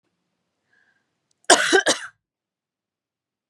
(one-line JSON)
{"cough_length": "3.5 s", "cough_amplitude": 32458, "cough_signal_mean_std_ratio": 0.25, "survey_phase": "beta (2021-08-13 to 2022-03-07)", "age": "45-64", "gender": "Female", "wearing_mask": "No", "symptom_none": true, "symptom_onset": "5 days", "smoker_status": "Ex-smoker", "respiratory_condition_asthma": false, "respiratory_condition_other": false, "recruitment_source": "REACT", "submission_delay": "1 day", "covid_test_result": "Negative", "covid_test_method": "RT-qPCR", "influenza_a_test_result": "Negative", "influenza_b_test_result": "Negative"}